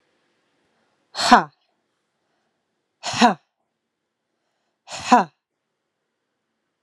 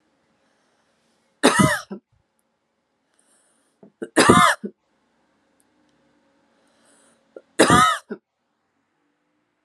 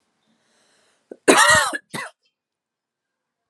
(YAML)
exhalation_length: 6.8 s
exhalation_amplitude: 32768
exhalation_signal_mean_std_ratio: 0.21
three_cough_length: 9.6 s
three_cough_amplitude: 32768
three_cough_signal_mean_std_ratio: 0.27
cough_length: 3.5 s
cough_amplitude: 32766
cough_signal_mean_std_ratio: 0.3
survey_phase: alpha (2021-03-01 to 2021-08-12)
age: 18-44
gender: Female
wearing_mask: 'No'
symptom_cough_any: true
symptom_fatigue: true
symptom_headache: true
symptom_change_to_sense_of_smell_or_taste: true
symptom_loss_of_taste: true
symptom_onset: 6 days
smoker_status: Never smoked
respiratory_condition_asthma: true
respiratory_condition_other: false
recruitment_source: Test and Trace
submission_delay: 2 days
covid_test_result: Positive
covid_test_method: RT-qPCR
covid_ct_value: 16.4
covid_ct_gene: N gene
covid_ct_mean: 17.0
covid_viral_load: 2700000 copies/ml
covid_viral_load_category: High viral load (>1M copies/ml)